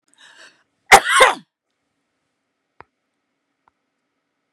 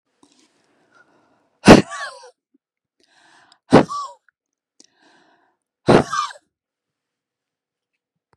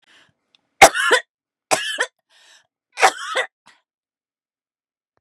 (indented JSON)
{
  "cough_length": "4.5 s",
  "cough_amplitude": 32768,
  "cough_signal_mean_std_ratio": 0.21,
  "exhalation_length": "8.4 s",
  "exhalation_amplitude": 32768,
  "exhalation_signal_mean_std_ratio": 0.2,
  "three_cough_length": "5.2 s",
  "three_cough_amplitude": 32768,
  "three_cough_signal_mean_std_ratio": 0.27,
  "survey_phase": "beta (2021-08-13 to 2022-03-07)",
  "age": "45-64",
  "gender": "Female",
  "wearing_mask": "No",
  "symptom_fatigue": true,
  "symptom_headache": true,
  "symptom_loss_of_taste": true,
  "symptom_onset": "12 days",
  "smoker_status": "Ex-smoker",
  "respiratory_condition_asthma": true,
  "respiratory_condition_other": false,
  "recruitment_source": "REACT",
  "submission_delay": "1 day",
  "covid_test_result": "Negative",
  "covid_test_method": "RT-qPCR",
  "influenza_a_test_result": "Negative",
  "influenza_b_test_result": "Negative"
}